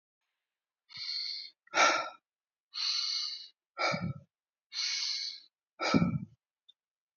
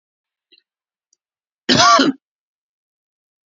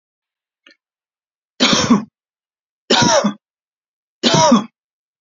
{"exhalation_length": "7.2 s", "exhalation_amplitude": 9115, "exhalation_signal_mean_std_ratio": 0.48, "cough_length": "3.5 s", "cough_amplitude": 31128, "cough_signal_mean_std_ratio": 0.29, "three_cough_length": "5.2 s", "three_cough_amplitude": 29749, "three_cough_signal_mean_std_ratio": 0.4, "survey_phase": "beta (2021-08-13 to 2022-03-07)", "age": "45-64", "gender": "Male", "wearing_mask": "No", "symptom_none": true, "smoker_status": "Never smoked", "respiratory_condition_asthma": false, "respiratory_condition_other": false, "recruitment_source": "REACT", "submission_delay": "-1 day", "covid_test_result": "Negative", "covid_test_method": "RT-qPCR", "influenza_a_test_result": "Negative", "influenza_b_test_result": "Negative"}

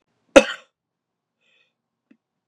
{"cough_length": "2.5 s", "cough_amplitude": 32768, "cough_signal_mean_std_ratio": 0.14, "survey_phase": "beta (2021-08-13 to 2022-03-07)", "age": "18-44", "gender": "Male", "wearing_mask": "No", "symptom_cough_any": true, "symptom_runny_or_blocked_nose": true, "smoker_status": "Current smoker (e-cigarettes or vapes only)", "respiratory_condition_asthma": false, "respiratory_condition_other": false, "recruitment_source": "REACT", "submission_delay": "7 days", "covid_test_result": "Negative", "covid_test_method": "RT-qPCR"}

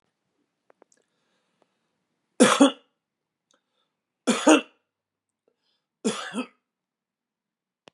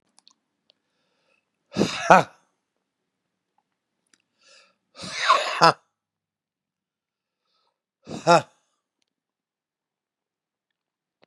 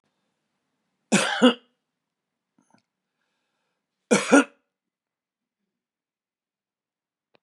{"three_cough_length": "7.9 s", "three_cough_amplitude": 29771, "three_cough_signal_mean_std_ratio": 0.22, "exhalation_length": "11.3 s", "exhalation_amplitude": 32767, "exhalation_signal_mean_std_ratio": 0.2, "cough_length": "7.4 s", "cough_amplitude": 25801, "cough_signal_mean_std_ratio": 0.21, "survey_phase": "beta (2021-08-13 to 2022-03-07)", "age": "65+", "gender": "Male", "wearing_mask": "No", "symptom_cough_any": true, "symptom_shortness_of_breath": true, "symptom_change_to_sense_of_smell_or_taste": true, "smoker_status": "Ex-smoker", "respiratory_condition_asthma": false, "respiratory_condition_other": false, "recruitment_source": "REACT", "submission_delay": "1 day", "covid_test_result": "Negative", "covid_test_method": "RT-qPCR", "influenza_a_test_result": "Negative", "influenza_b_test_result": "Negative"}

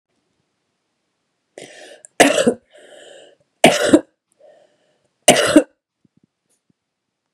{"three_cough_length": "7.3 s", "three_cough_amplitude": 32768, "three_cough_signal_mean_std_ratio": 0.27, "survey_phase": "beta (2021-08-13 to 2022-03-07)", "age": "45-64", "gender": "Female", "wearing_mask": "No", "symptom_cough_any": true, "symptom_runny_or_blocked_nose": true, "symptom_sore_throat": true, "symptom_fatigue": true, "symptom_headache": true, "symptom_onset": "3 days", "smoker_status": "Ex-smoker", "respiratory_condition_asthma": true, "respiratory_condition_other": false, "recruitment_source": "Test and Trace", "submission_delay": "2 days", "covid_test_result": "Negative", "covid_test_method": "RT-qPCR"}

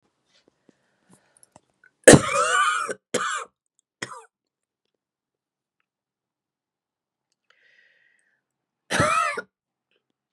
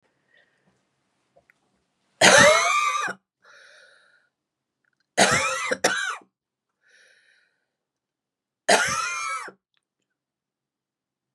{"cough_length": "10.3 s", "cough_amplitude": 32768, "cough_signal_mean_std_ratio": 0.24, "three_cough_length": "11.3 s", "three_cough_amplitude": 29994, "three_cough_signal_mean_std_ratio": 0.33, "survey_phase": "beta (2021-08-13 to 2022-03-07)", "age": "45-64", "gender": "Female", "wearing_mask": "No", "symptom_cough_any": true, "symptom_runny_or_blocked_nose": true, "symptom_shortness_of_breath": true, "symptom_sore_throat": true, "symptom_diarrhoea": true, "symptom_headache": true, "symptom_change_to_sense_of_smell_or_taste": true, "symptom_onset": "4 days", "smoker_status": "Ex-smoker", "respiratory_condition_asthma": false, "respiratory_condition_other": false, "recruitment_source": "Test and Trace", "submission_delay": "1 day", "covid_test_result": "Positive", "covid_test_method": "RT-qPCR", "covid_ct_value": 19.9, "covid_ct_gene": "N gene"}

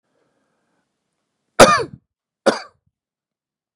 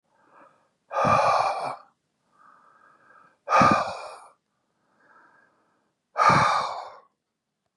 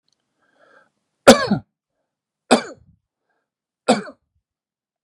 {"cough_length": "3.8 s", "cough_amplitude": 32768, "cough_signal_mean_std_ratio": 0.21, "exhalation_length": "7.8 s", "exhalation_amplitude": 17764, "exhalation_signal_mean_std_ratio": 0.4, "three_cough_length": "5.0 s", "three_cough_amplitude": 32768, "three_cough_signal_mean_std_ratio": 0.21, "survey_phase": "beta (2021-08-13 to 2022-03-07)", "age": "45-64", "gender": "Male", "wearing_mask": "No", "symptom_none": true, "smoker_status": "Never smoked", "respiratory_condition_asthma": false, "respiratory_condition_other": false, "recruitment_source": "REACT", "submission_delay": "4 days", "covid_test_result": "Negative", "covid_test_method": "RT-qPCR", "influenza_a_test_result": "Negative", "influenza_b_test_result": "Negative"}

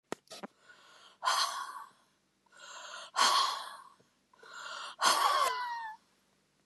{"exhalation_length": "6.7 s", "exhalation_amplitude": 8882, "exhalation_signal_mean_std_ratio": 0.47, "survey_phase": "beta (2021-08-13 to 2022-03-07)", "age": "45-64", "gender": "Female", "wearing_mask": "No", "symptom_none": true, "smoker_status": "Ex-smoker", "respiratory_condition_asthma": true, "respiratory_condition_other": false, "recruitment_source": "REACT", "submission_delay": "1 day", "covid_test_result": "Negative", "covid_test_method": "RT-qPCR", "influenza_a_test_result": "Negative", "influenza_b_test_result": "Negative"}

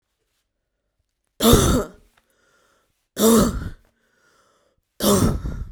{"three_cough_length": "5.7 s", "three_cough_amplitude": 32364, "three_cough_signal_mean_std_ratio": 0.4, "survey_phase": "beta (2021-08-13 to 2022-03-07)", "age": "18-44", "gender": "Female", "wearing_mask": "No", "symptom_cough_any": true, "symptom_shortness_of_breath": true, "symptom_sore_throat": true, "symptom_fatigue": true, "symptom_headache": true, "smoker_status": "Current smoker (1 to 10 cigarettes per day)", "respiratory_condition_asthma": false, "respiratory_condition_other": false, "recruitment_source": "Test and Trace", "submission_delay": "1 day", "covid_test_result": "Positive", "covid_test_method": "RT-qPCR", "covid_ct_value": 22.1, "covid_ct_gene": "ORF1ab gene", "covid_ct_mean": 22.6, "covid_viral_load": "38000 copies/ml", "covid_viral_load_category": "Low viral load (10K-1M copies/ml)"}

